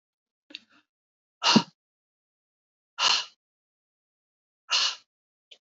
{"exhalation_length": "5.6 s", "exhalation_amplitude": 18193, "exhalation_signal_mean_std_ratio": 0.25, "survey_phase": "beta (2021-08-13 to 2022-03-07)", "age": "45-64", "gender": "Female", "wearing_mask": "No", "symptom_none": true, "symptom_onset": "11 days", "smoker_status": "Never smoked", "respiratory_condition_asthma": false, "respiratory_condition_other": false, "recruitment_source": "REACT", "submission_delay": "2 days", "covid_test_result": "Negative", "covid_test_method": "RT-qPCR", "influenza_a_test_result": "Negative", "influenza_b_test_result": "Negative"}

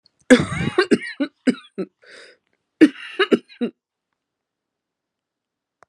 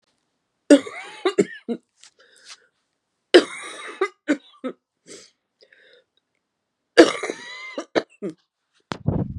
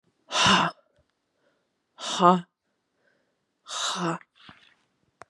{"cough_length": "5.9 s", "cough_amplitude": 32767, "cough_signal_mean_std_ratio": 0.29, "three_cough_length": "9.4 s", "three_cough_amplitude": 32768, "three_cough_signal_mean_std_ratio": 0.25, "exhalation_length": "5.3 s", "exhalation_amplitude": 25079, "exhalation_signal_mean_std_ratio": 0.33, "survey_phase": "beta (2021-08-13 to 2022-03-07)", "age": "45-64", "gender": "Female", "wearing_mask": "No", "symptom_cough_any": true, "symptom_sore_throat": true, "symptom_fatigue": true, "symptom_fever_high_temperature": true, "symptom_headache": true, "symptom_other": true, "symptom_onset": "2 days", "smoker_status": "Ex-smoker", "respiratory_condition_asthma": false, "respiratory_condition_other": false, "recruitment_source": "Test and Trace", "submission_delay": "1 day", "covid_test_result": "Positive", "covid_test_method": "RT-qPCR"}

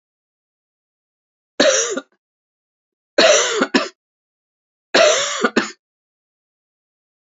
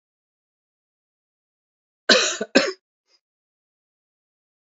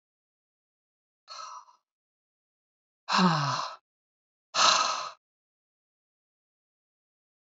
{"three_cough_length": "7.3 s", "three_cough_amplitude": 31762, "three_cough_signal_mean_std_ratio": 0.36, "cough_length": "4.6 s", "cough_amplitude": 28102, "cough_signal_mean_std_ratio": 0.22, "exhalation_length": "7.5 s", "exhalation_amplitude": 14064, "exhalation_signal_mean_std_ratio": 0.3, "survey_phase": "beta (2021-08-13 to 2022-03-07)", "age": "45-64", "gender": "Female", "wearing_mask": "No", "symptom_cough_any": true, "symptom_new_continuous_cough": true, "symptom_shortness_of_breath": true, "symptom_sore_throat": true, "symptom_fatigue": true, "symptom_change_to_sense_of_smell_or_taste": true, "symptom_loss_of_taste": true, "symptom_onset": "6 days", "smoker_status": "Ex-smoker", "respiratory_condition_asthma": false, "respiratory_condition_other": false, "recruitment_source": "Test and Trace", "submission_delay": "2 days", "covid_test_result": "Positive", "covid_test_method": "RT-qPCR", "covid_ct_value": 12.7, "covid_ct_gene": "ORF1ab gene", "covid_ct_mean": 13.1, "covid_viral_load": "50000000 copies/ml", "covid_viral_load_category": "High viral load (>1M copies/ml)"}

